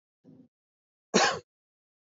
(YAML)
cough_length: 2.0 s
cough_amplitude: 14765
cough_signal_mean_std_ratio: 0.26
survey_phase: beta (2021-08-13 to 2022-03-07)
age: 18-44
gender: Male
wearing_mask: 'No'
symptom_none: true
smoker_status: Current smoker (1 to 10 cigarettes per day)
respiratory_condition_asthma: false
respiratory_condition_other: false
recruitment_source: REACT
submission_delay: 2 days
covid_test_result: Negative
covid_test_method: RT-qPCR
influenza_a_test_result: Unknown/Void
influenza_b_test_result: Unknown/Void